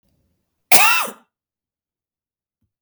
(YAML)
cough_length: 2.8 s
cough_amplitude: 32768
cough_signal_mean_std_ratio: 0.27
survey_phase: beta (2021-08-13 to 2022-03-07)
age: 45-64
gender: Female
wearing_mask: 'No'
symptom_none: true
smoker_status: Never smoked
respiratory_condition_asthma: false
respiratory_condition_other: false
recruitment_source: REACT
submission_delay: 0 days
covid_test_result: Negative
covid_test_method: RT-qPCR